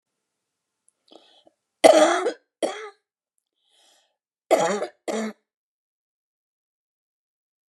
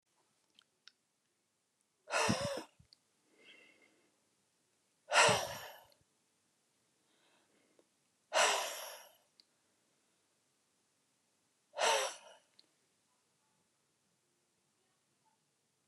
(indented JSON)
{
  "cough_length": "7.7 s",
  "cough_amplitude": 32741,
  "cough_signal_mean_std_ratio": 0.26,
  "exhalation_length": "15.9 s",
  "exhalation_amplitude": 6500,
  "exhalation_signal_mean_std_ratio": 0.26,
  "survey_phase": "beta (2021-08-13 to 2022-03-07)",
  "age": "45-64",
  "gender": "Female",
  "wearing_mask": "No",
  "symptom_none": true,
  "smoker_status": "Ex-smoker",
  "respiratory_condition_asthma": false,
  "respiratory_condition_other": false,
  "recruitment_source": "REACT",
  "submission_delay": "1 day",
  "covid_test_result": "Negative",
  "covid_test_method": "RT-qPCR"
}